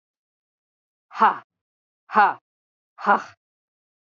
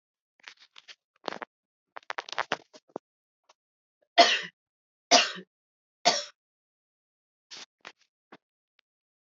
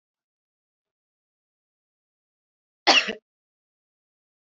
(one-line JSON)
{"exhalation_length": "4.0 s", "exhalation_amplitude": 23202, "exhalation_signal_mean_std_ratio": 0.27, "three_cough_length": "9.3 s", "three_cough_amplitude": 20321, "three_cough_signal_mean_std_ratio": 0.2, "cough_length": "4.4 s", "cough_amplitude": 21545, "cough_signal_mean_std_ratio": 0.16, "survey_phase": "beta (2021-08-13 to 2022-03-07)", "age": "45-64", "gender": "Female", "wearing_mask": "No", "symptom_cough_any": true, "symptom_runny_or_blocked_nose": true, "symptom_fatigue": true, "symptom_headache": true, "smoker_status": "Never smoked", "respiratory_condition_asthma": false, "respiratory_condition_other": false, "recruitment_source": "Test and Trace", "submission_delay": "3 days", "covid_test_result": "Positive", "covid_test_method": "RT-qPCR"}